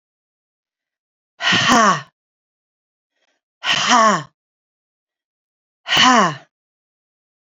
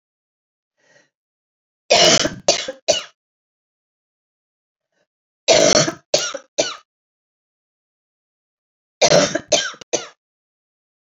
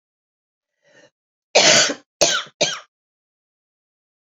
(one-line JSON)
{"exhalation_length": "7.6 s", "exhalation_amplitude": 29463, "exhalation_signal_mean_std_ratio": 0.36, "three_cough_length": "11.0 s", "three_cough_amplitude": 32767, "three_cough_signal_mean_std_ratio": 0.32, "cough_length": "4.4 s", "cough_amplitude": 29520, "cough_signal_mean_std_ratio": 0.31, "survey_phase": "beta (2021-08-13 to 2022-03-07)", "age": "45-64", "gender": "Female", "wearing_mask": "No", "symptom_cough_any": true, "symptom_runny_or_blocked_nose": true, "symptom_sore_throat": true, "symptom_headache": true, "smoker_status": "Never smoked", "respiratory_condition_asthma": true, "respiratory_condition_other": false, "recruitment_source": "Test and Trace", "submission_delay": "3 days", "covid_test_method": "ePCR"}